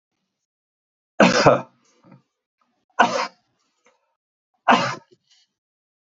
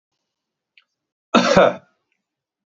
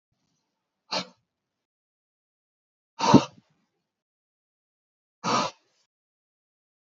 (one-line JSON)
{"three_cough_length": "6.1 s", "three_cough_amplitude": 32767, "three_cough_signal_mean_std_ratio": 0.28, "cough_length": "2.7 s", "cough_amplitude": 28305, "cough_signal_mean_std_ratio": 0.29, "exhalation_length": "6.8 s", "exhalation_amplitude": 26582, "exhalation_signal_mean_std_ratio": 0.19, "survey_phase": "beta (2021-08-13 to 2022-03-07)", "age": "45-64", "gender": "Male", "wearing_mask": "No", "symptom_none": true, "smoker_status": "Never smoked", "respiratory_condition_asthma": false, "respiratory_condition_other": false, "recruitment_source": "REACT", "submission_delay": "2 days", "covid_test_result": "Negative", "covid_test_method": "RT-qPCR", "influenza_a_test_result": "Negative", "influenza_b_test_result": "Negative"}